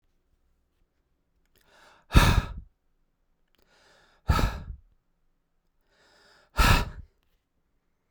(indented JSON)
{
  "exhalation_length": "8.1 s",
  "exhalation_amplitude": 22975,
  "exhalation_signal_mean_std_ratio": 0.26,
  "survey_phase": "beta (2021-08-13 to 2022-03-07)",
  "age": "18-44",
  "gender": "Male",
  "wearing_mask": "No",
  "symptom_none": true,
  "smoker_status": "Never smoked",
  "respiratory_condition_asthma": false,
  "respiratory_condition_other": false,
  "recruitment_source": "REACT",
  "submission_delay": "0 days",
  "covid_test_result": "Negative",
  "covid_test_method": "RT-qPCR"
}